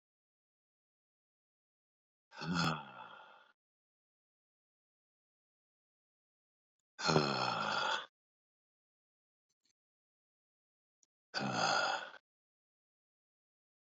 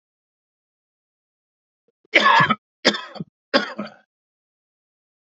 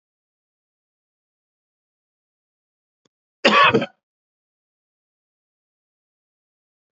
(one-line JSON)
{"exhalation_length": "14.0 s", "exhalation_amplitude": 5612, "exhalation_signal_mean_std_ratio": 0.31, "three_cough_length": "5.3 s", "three_cough_amplitude": 29579, "three_cough_signal_mean_std_ratio": 0.28, "cough_length": "6.9 s", "cough_amplitude": 29916, "cough_signal_mean_std_ratio": 0.18, "survey_phase": "beta (2021-08-13 to 2022-03-07)", "age": "18-44", "gender": "Male", "wearing_mask": "No", "symptom_none": true, "smoker_status": "Current smoker (11 or more cigarettes per day)", "respiratory_condition_asthma": false, "respiratory_condition_other": false, "recruitment_source": "REACT", "submission_delay": "0 days", "covid_test_result": "Negative", "covid_test_method": "RT-qPCR"}